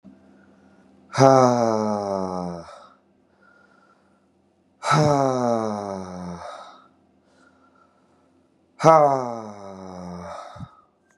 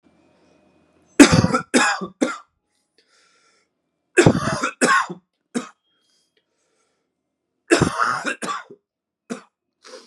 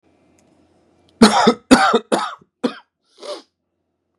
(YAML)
exhalation_length: 11.2 s
exhalation_amplitude: 32756
exhalation_signal_mean_std_ratio: 0.38
three_cough_length: 10.1 s
three_cough_amplitude: 32768
three_cough_signal_mean_std_ratio: 0.33
cough_length: 4.2 s
cough_amplitude: 32768
cough_signal_mean_std_ratio: 0.34
survey_phase: beta (2021-08-13 to 2022-03-07)
age: 18-44
gender: Male
wearing_mask: 'Yes'
symptom_cough_any: true
symptom_runny_or_blocked_nose: true
symptom_sore_throat: true
symptom_fatigue: true
symptom_headache: true
symptom_change_to_sense_of_smell_or_taste: true
symptom_loss_of_taste: true
symptom_onset: 3 days
smoker_status: Never smoked
respiratory_condition_asthma: false
respiratory_condition_other: false
recruitment_source: Test and Trace
submission_delay: 2 days
covid_test_result: Positive
covid_test_method: RT-qPCR
covid_ct_value: 17.2
covid_ct_gene: N gene
covid_ct_mean: 17.3
covid_viral_load: 2100000 copies/ml
covid_viral_load_category: High viral load (>1M copies/ml)